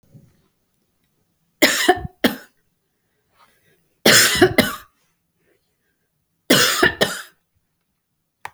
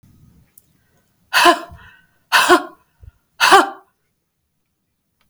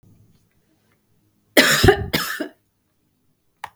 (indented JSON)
{
  "three_cough_length": "8.5 s",
  "three_cough_amplitude": 32768,
  "three_cough_signal_mean_std_ratio": 0.32,
  "exhalation_length": "5.3 s",
  "exhalation_amplitude": 32768,
  "exhalation_signal_mean_std_ratio": 0.31,
  "cough_length": "3.8 s",
  "cough_amplitude": 32768,
  "cough_signal_mean_std_ratio": 0.31,
  "survey_phase": "beta (2021-08-13 to 2022-03-07)",
  "age": "45-64",
  "gender": "Female",
  "wearing_mask": "No",
  "symptom_cough_any": true,
  "symptom_runny_or_blocked_nose": true,
  "smoker_status": "Never smoked",
  "respiratory_condition_asthma": false,
  "respiratory_condition_other": false,
  "recruitment_source": "REACT",
  "submission_delay": "1 day",
  "covid_test_result": "Negative",
  "covid_test_method": "RT-qPCR",
  "influenza_a_test_result": "Negative",
  "influenza_b_test_result": "Negative"
}